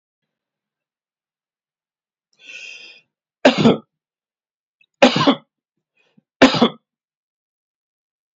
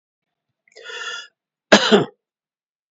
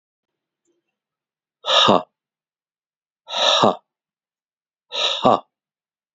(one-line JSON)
{"three_cough_length": "8.4 s", "three_cough_amplitude": 29607, "three_cough_signal_mean_std_ratio": 0.24, "cough_length": "2.9 s", "cough_amplitude": 28944, "cough_signal_mean_std_ratio": 0.28, "exhalation_length": "6.1 s", "exhalation_amplitude": 32768, "exhalation_signal_mean_std_ratio": 0.32, "survey_phase": "beta (2021-08-13 to 2022-03-07)", "age": "45-64", "gender": "Male", "wearing_mask": "No", "symptom_none": true, "smoker_status": "Never smoked", "respiratory_condition_asthma": false, "respiratory_condition_other": false, "recruitment_source": "REACT", "submission_delay": "2 days", "covid_test_result": "Negative", "covid_test_method": "RT-qPCR", "influenza_a_test_result": "Negative", "influenza_b_test_result": "Negative"}